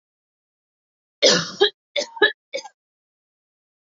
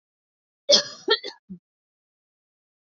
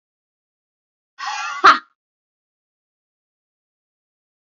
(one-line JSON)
{"three_cough_length": "3.8 s", "three_cough_amplitude": 27619, "three_cough_signal_mean_std_ratio": 0.29, "cough_length": "2.8 s", "cough_amplitude": 26278, "cough_signal_mean_std_ratio": 0.24, "exhalation_length": "4.4 s", "exhalation_amplitude": 28674, "exhalation_signal_mean_std_ratio": 0.19, "survey_phase": "alpha (2021-03-01 to 2021-08-12)", "age": "18-44", "gender": "Female", "wearing_mask": "No", "symptom_none": true, "smoker_status": "Ex-smoker", "respiratory_condition_asthma": false, "respiratory_condition_other": false, "recruitment_source": "REACT", "submission_delay": "8 days", "covid_test_result": "Negative", "covid_test_method": "RT-qPCR"}